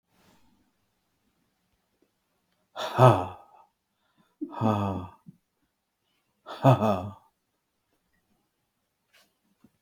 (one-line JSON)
{"exhalation_length": "9.8 s", "exhalation_amplitude": 27111, "exhalation_signal_mean_std_ratio": 0.24, "survey_phase": "beta (2021-08-13 to 2022-03-07)", "age": "65+", "gender": "Male", "wearing_mask": "No", "symptom_none": true, "smoker_status": "Never smoked", "respiratory_condition_asthma": false, "respiratory_condition_other": false, "recruitment_source": "REACT", "submission_delay": "0 days", "covid_test_result": "Negative", "covid_test_method": "RT-qPCR"}